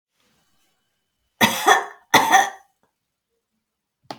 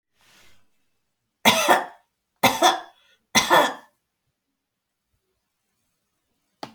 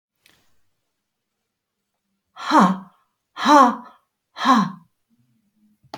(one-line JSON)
{"cough_length": "4.2 s", "cough_amplitude": 31542, "cough_signal_mean_std_ratio": 0.31, "three_cough_length": "6.7 s", "three_cough_amplitude": 30913, "three_cough_signal_mean_std_ratio": 0.3, "exhalation_length": "6.0 s", "exhalation_amplitude": 25488, "exhalation_signal_mean_std_ratio": 0.31, "survey_phase": "alpha (2021-03-01 to 2021-08-12)", "age": "45-64", "gender": "Female", "wearing_mask": "No", "symptom_none": true, "smoker_status": "Never smoked", "respiratory_condition_asthma": false, "respiratory_condition_other": false, "recruitment_source": "REACT", "submission_delay": "1 day", "covid_test_result": "Negative", "covid_test_method": "RT-qPCR"}